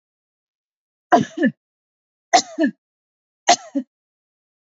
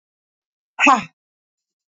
{"three_cough_length": "4.7 s", "three_cough_amplitude": 27331, "three_cough_signal_mean_std_ratio": 0.27, "exhalation_length": "1.9 s", "exhalation_amplitude": 27848, "exhalation_signal_mean_std_ratio": 0.26, "survey_phase": "beta (2021-08-13 to 2022-03-07)", "age": "45-64", "gender": "Female", "wearing_mask": "Yes", "symptom_none": true, "smoker_status": "Ex-smoker", "respiratory_condition_asthma": false, "respiratory_condition_other": false, "recruitment_source": "REACT", "submission_delay": "7 days", "covid_test_result": "Negative", "covid_test_method": "RT-qPCR", "influenza_a_test_result": "Negative", "influenza_b_test_result": "Negative"}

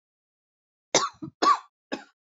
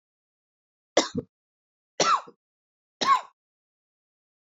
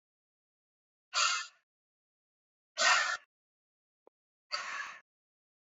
{"cough_length": "2.4 s", "cough_amplitude": 15969, "cough_signal_mean_std_ratio": 0.3, "three_cough_length": "4.5 s", "three_cough_amplitude": 15591, "three_cough_signal_mean_std_ratio": 0.27, "exhalation_length": "5.7 s", "exhalation_amplitude": 7398, "exhalation_signal_mean_std_ratio": 0.31, "survey_phase": "beta (2021-08-13 to 2022-03-07)", "age": "45-64", "gender": "Female", "wearing_mask": "No", "symptom_cough_any": true, "symptom_shortness_of_breath": true, "symptom_fatigue": true, "symptom_change_to_sense_of_smell_or_taste": true, "symptom_loss_of_taste": true, "smoker_status": "Never smoked", "respiratory_condition_asthma": false, "respiratory_condition_other": false, "recruitment_source": "Test and Trace", "submission_delay": "3 days", "covid_test_result": "Positive", "covid_test_method": "ePCR"}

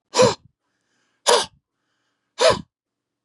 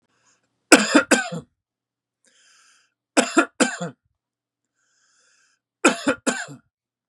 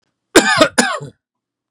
{"exhalation_length": "3.2 s", "exhalation_amplitude": 29890, "exhalation_signal_mean_std_ratio": 0.32, "three_cough_length": "7.1 s", "three_cough_amplitude": 32768, "three_cough_signal_mean_std_ratio": 0.29, "cough_length": "1.7 s", "cough_amplitude": 32768, "cough_signal_mean_std_ratio": 0.42, "survey_phase": "beta (2021-08-13 to 2022-03-07)", "age": "45-64", "gender": "Male", "wearing_mask": "No", "symptom_none": true, "smoker_status": "Never smoked", "respiratory_condition_asthma": false, "respiratory_condition_other": false, "recruitment_source": "REACT", "submission_delay": "5 days", "covid_test_result": "Negative", "covid_test_method": "RT-qPCR", "influenza_a_test_result": "Negative", "influenza_b_test_result": "Negative"}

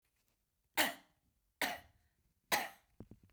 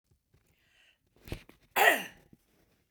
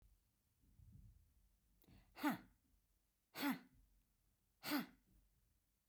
{"three_cough_length": "3.3 s", "three_cough_amplitude": 4757, "three_cough_signal_mean_std_ratio": 0.29, "cough_length": "2.9 s", "cough_amplitude": 12820, "cough_signal_mean_std_ratio": 0.25, "exhalation_length": "5.9 s", "exhalation_amplitude": 1368, "exhalation_signal_mean_std_ratio": 0.3, "survey_phase": "beta (2021-08-13 to 2022-03-07)", "age": "65+", "gender": "Female", "wearing_mask": "No", "symptom_none": true, "smoker_status": "Ex-smoker", "respiratory_condition_asthma": false, "respiratory_condition_other": false, "recruitment_source": "Test and Trace", "submission_delay": "0 days", "covid_test_result": "Negative", "covid_test_method": "LFT"}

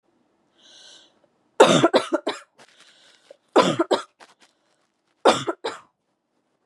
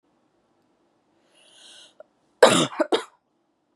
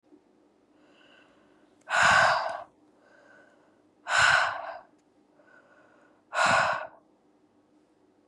{"three_cough_length": "6.7 s", "three_cough_amplitude": 31730, "three_cough_signal_mean_std_ratio": 0.3, "cough_length": "3.8 s", "cough_amplitude": 32740, "cough_signal_mean_std_ratio": 0.24, "exhalation_length": "8.3 s", "exhalation_amplitude": 13172, "exhalation_signal_mean_std_ratio": 0.37, "survey_phase": "beta (2021-08-13 to 2022-03-07)", "age": "18-44", "gender": "Female", "wearing_mask": "No", "symptom_none": true, "smoker_status": "Ex-smoker", "respiratory_condition_asthma": false, "respiratory_condition_other": false, "recruitment_source": "REACT", "submission_delay": "2 days", "covid_test_result": "Negative", "covid_test_method": "RT-qPCR", "influenza_a_test_result": "Negative", "influenza_b_test_result": "Negative"}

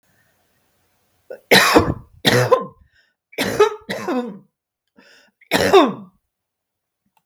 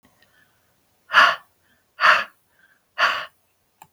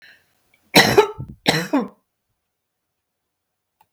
{"three_cough_length": "7.3 s", "three_cough_amplitude": 32768, "three_cough_signal_mean_std_ratio": 0.38, "exhalation_length": "3.9 s", "exhalation_amplitude": 32175, "exhalation_signal_mean_std_ratio": 0.31, "cough_length": "3.9 s", "cough_amplitude": 32768, "cough_signal_mean_std_ratio": 0.29, "survey_phase": "beta (2021-08-13 to 2022-03-07)", "age": "45-64", "gender": "Female", "wearing_mask": "No", "symptom_none": true, "smoker_status": "Never smoked", "respiratory_condition_asthma": false, "respiratory_condition_other": false, "recruitment_source": "REACT", "submission_delay": "1 day", "covid_test_result": "Negative", "covid_test_method": "RT-qPCR", "influenza_a_test_result": "Negative", "influenza_b_test_result": "Negative"}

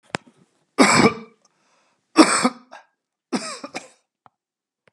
{"three_cough_length": "4.9 s", "three_cough_amplitude": 32767, "three_cough_signal_mean_std_ratio": 0.3, "survey_phase": "beta (2021-08-13 to 2022-03-07)", "age": "45-64", "gender": "Male", "wearing_mask": "No", "symptom_none": true, "smoker_status": "Never smoked", "respiratory_condition_asthma": false, "respiratory_condition_other": false, "recruitment_source": "REACT", "submission_delay": "11 days", "covid_test_result": "Negative", "covid_test_method": "RT-qPCR", "influenza_a_test_result": "Negative", "influenza_b_test_result": "Negative"}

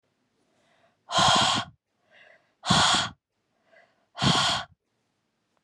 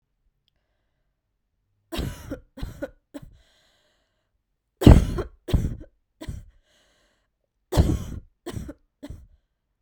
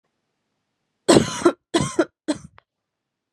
{"exhalation_length": "5.6 s", "exhalation_amplitude": 14870, "exhalation_signal_mean_std_ratio": 0.41, "three_cough_length": "9.8 s", "three_cough_amplitude": 32768, "three_cough_signal_mean_std_ratio": 0.23, "cough_length": "3.3 s", "cough_amplitude": 32752, "cough_signal_mean_std_ratio": 0.31, "survey_phase": "beta (2021-08-13 to 2022-03-07)", "age": "18-44", "gender": "Female", "wearing_mask": "No", "symptom_cough_any": true, "symptom_new_continuous_cough": true, "symptom_runny_or_blocked_nose": true, "symptom_sore_throat": true, "symptom_fever_high_temperature": true, "symptom_headache": true, "symptom_loss_of_taste": true, "symptom_other": true, "symptom_onset": "3 days", "smoker_status": "Never smoked", "respiratory_condition_asthma": false, "respiratory_condition_other": false, "recruitment_source": "Test and Trace", "submission_delay": "2 days", "covid_test_result": "Positive", "covid_test_method": "ePCR"}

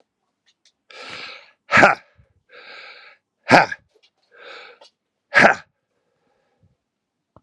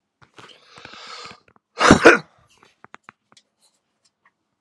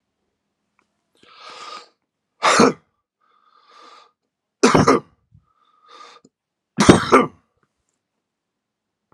{"exhalation_length": "7.4 s", "exhalation_amplitude": 32768, "exhalation_signal_mean_std_ratio": 0.23, "cough_length": "4.6 s", "cough_amplitude": 32768, "cough_signal_mean_std_ratio": 0.21, "three_cough_length": "9.1 s", "three_cough_amplitude": 32768, "three_cough_signal_mean_std_ratio": 0.26, "survey_phase": "beta (2021-08-13 to 2022-03-07)", "age": "45-64", "gender": "Male", "wearing_mask": "No", "symptom_cough_any": true, "symptom_runny_or_blocked_nose": true, "symptom_onset": "6 days", "smoker_status": "Current smoker (11 or more cigarettes per day)", "respiratory_condition_asthma": false, "respiratory_condition_other": false, "recruitment_source": "Test and Trace", "submission_delay": "1 day", "covid_test_result": "Positive", "covid_test_method": "RT-qPCR", "covid_ct_value": 19.0, "covid_ct_gene": "ORF1ab gene"}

